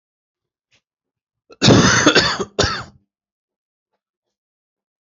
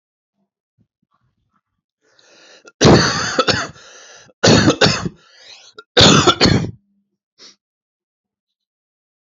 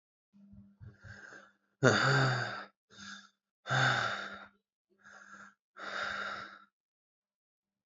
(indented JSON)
{
  "cough_length": "5.1 s",
  "cough_amplitude": 29735,
  "cough_signal_mean_std_ratio": 0.34,
  "three_cough_length": "9.2 s",
  "three_cough_amplitude": 32767,
  "three_cough_signal_mean_std_ratio": 0.36,
  "exhalation_length": "7.9 s",
  "exhalation_amplitude": 10832,
  "exhalation_signal_mean_std_ratio": 0.4,
  "survey_phase": "alpha (2021-03-01 to 2021-08-12)",
  "age": "18-44",
  "gender": "Male",
  "wearing_mask": "Yes",
  "symptom_cough_any": true,
  "symptom_fever_high_temperature": true,
  "symptom_headache": true,
  "symptom_change_to_sense_of_smell_or_taste": true,
  "symptom_onset": "4 days",
  "smoker_status": "Current smoker (11 or more cigarettes per day)",
  "respiratory_condition_asthma": false,
  "respiratory_condition_other": false,
  "recruitment_source": "Test and Trace",
  "submission_delay": "2 days",
  "covid_test_result": "Positive",
  "covid_test_method": "RT-qPCR",
  "covid_ct_value": 14.1,
  "covid_ct_gene": "ORF1ab gene",
  "covid_ct_mean": 14.2,
  "covid_viral_load": "21000000 copies/ml",
  "covid_viral_load_category": "High viral load (>1M copies/ml)"
}